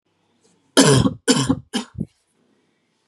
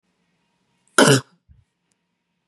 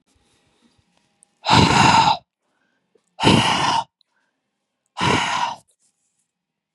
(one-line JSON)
{"three_cough_length": "3.1 s", "three_cough_amplitude": 32026, "three_cough_signal_mean_std_ratio": 0.37, "cough_length": "2.5 s", "cough_amplitude": 32767, "cough_signal_mean_std_ratio": 0.23, "exhalation_length": "6.7 s", "exhalation_amplitude": 31621, "exhalation_signal_mean_std_ratio": 0.42, "survey_phase": "beta (2021-08-13 to 2022-03-07)", "age": "18-44", "gender": "Female", "wearing_mask": "No", "symptom_cough_any": true, "symptom_runny_or_blocked_nose": true, "symptom_sore_throat": true, "symptom_fatigue": true, "smoker_status": "Never smoked", "respiratory_condition_asthma": false, "respiratory_condition_other": false, "recruitment_source": "Test and Trace", "submission_delay": "1 day", "covid_test_result": "Positive", "covid_test_method": "LFT"}